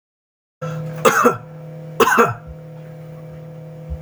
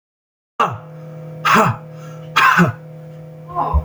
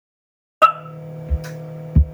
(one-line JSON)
{"three_cough_length": "4.0 s", "three_cough_amplitude": 30642, "three_cough_signal_mean_std_ratio": 0.48, "exhalation_length": "3.8 s", "exhalation_amplitude": 29248, "exhalation_signal_mean_std_ratio": 0.54, "cough_length": "2.1 s", "cough_amplitude": 27459, "cough_signal_mean_std_ratio": 0.41, "survey_phase": "beta (2021-08-13 to 2022-03-07)", "age": "45-64", "gender": "Male", "wearing_mask": "No", "symptom_none": true, "smoker_status": "Never smoked", "respiratory_condition_asthma": false, "respiratory_condition_other": false, "recruitment_source": "REACT", "submission_delay": "3 days", "covid_test_result": "Negative", "covid_test_method": "RT-qPCR", "influenza_a_test_result": "Negative", "influenza_b_test_result": "Negative"}